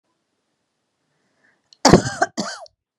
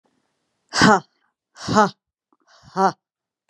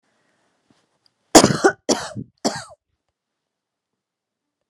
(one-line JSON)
{"cough_length": "3.0 s", "cough_amplitude": 32768, "cough_signal_mean_std_ratio": 0.24, "exhalation_length": "3.5 s", "exhalation_amplitude": 30242, "exhalation_signal_mean_std_ratio": 0.31, "three_cough_length": "4.7 s", "three_cough_amplitude": 32768, "three_cough_signal_mean_std_ratio": 0.23, "survey_phase": "beta (2021-08-13 to 2022-03-07)", "age": "18-44", "gender": "Female", "wearing_mask": "No", "symptom_none": true, "smoker_status": "Never smoked", "respiratory_condition_asthma": false, "respiratory_condition_other": false, "recruitment_source": "REACT", "submission_delay": "2 days", "covid_test_result": "Negative", "covid_test_method": "RT-qPCR", "influenza_a_test_result": "Negative", "influenza_b_test_result": "Negative"}